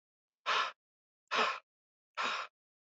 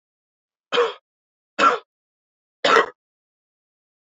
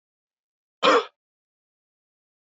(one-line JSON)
{"exhalation_length": "2.9 s", "exhalation_amplitude": 3719, "exhalation_signal_mean_std_ratio": 0.41, "three_cough_length": "4.2 s", "three_cough_amplitude": 32767, "three_cough_signal_mean_std_ratio": 0.29, "cough_length": "2.6 s", "cough_amplitude": 18822, "cough_signal_mean_std_ratio": 0.22, "survey_phase": "alpha (2021-03-01 to 2021-08-12)", "age": "18-44", "gender": "Male", "wearing_mask": "No", "symptom_cough_any": true, "symptom_fatigue": true, "symptom_fever_high_temperature": true, "symptom_headache": true, "symptom_onset": "4 days", "smoker_status": "Never smoked", "respiratory_condition_asthma": false, "respiratory_condition_other": false, "recruitment_source": "Test and Trace", "submission_delay": "2 days", "covid_test_result": "Positive", "covid_test_method": "RT-qPCR", "covid_ct_value": 15.8, "covid_ct_gene": "N gene", "covid_ct_mean": 16.2, "covid_viral_load": "4900000 copies/ml", "covid_viral_load_category": "High viral load (>1M copies/ml)"}